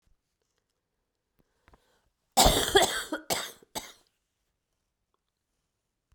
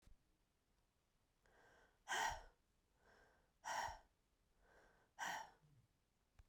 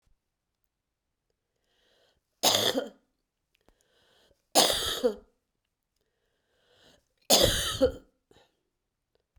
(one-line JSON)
{"cough_length": "6.1 s", "cough_amplitude": 19300, "cough_signal_mean_std_ratio": 0.26, "exhalation_length": "6.5 s", "exhalation_amplitude": 893, "exhalation_signal_mean_std_ratio": 0.34, "three_cough_length": "9.4 s", "three_cough_amplitude": 16849, "three_cough_signal_mean_std_ratio": 0.3, "survey_phase": "beta (2021-08-13 to 2022-03-07)", "age": "45-64", "gender": "Female", "wearing_mask": "No", "symptom_cough_any": true, "symptom_runny_or_blocked_nose": true, "symptom_sore_throat": true, "symptom_fatigue": true, "symptom_fever_high_temperature": true, "symptom_headache": true, "symptom_change_to_sense_of_smell_or_taste": true, "symptom_loss_of_taste": true, "smoker_status": "Never smoked", "respiratory_condition_asthma": false, "respiratory_condition_other": false, "recruitment_source": "Test and Trace", "submission_delay": "1 day", "covid_test_result": "Positive", "covid_test_method": "RT-qPCR", "covid_ct_value": 14.8, "covid_ct_gene": "ORF1ab gene", "covid_ct_mean": 15.2, "covid_viral_load": "10000000 copies/ml", "covid_viral_load_category": "High viral load (>1M copies/ml)"}